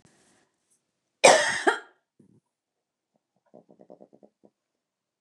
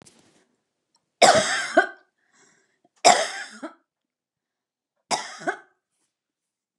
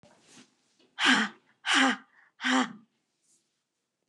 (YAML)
cough_length: 5.2 s
cough_amplitude: 29203
cough_signal_mean_std_ratio: 0.21
three_cough_length: 6.8 s
three_cough_amplitude: 28959
three_cough_signal_mean_std_ratio: 0.28
exhalation_length: 4.1 s
exhalation_amplitude: 14272
exhalation_signal_mean_std_ratio: 0.37
survey_phase: beta (2021-08-13 to 2022-03-07)
age: 45-64
gender: Female
wearing_mask: 'No'
symptom_none: true
smoker_status: Never smoked
respiratory_condition_asthma: false
respiratory_condition_other: false
recruitment_source: REACT
submission_delay: 1 day
covid_test_result: Negative
covid_test_method: RT-qPCR
influenza_a_test_result: Negative
influenza_b_test_result: Negative